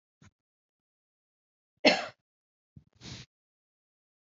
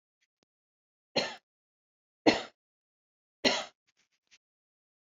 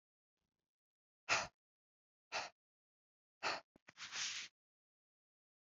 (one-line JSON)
{"cough_length": "4.3 s", "cough_amplitude": 13885, "cough_signal_mean_std_ratio": 0.16, "three_cough_length": "5.1 s", "three_cough_amplitude": 16383, "three_cough_signal_mean_std_ratio": 0.21, "exhalation_length": "5.6 s", "exhalation_amplitude": 2586, "exhalation_signal_mean_std_ratio": 0.29, "survey_phase": "beta (2021-08-13 to 2022-03-07)", "age": "45-64", "gender": "Female", "wearing_mask": "No", "symptom_none": true, "smoker_status": "Ex-smoker", "respiratory_condition_asthma": false, "respiratory_condition_other": false, "recruitment_source": "REACT", "submission_delay": "1 day", "covid_test_result": "Negative", "covid_test_method": "RT-qPCR"}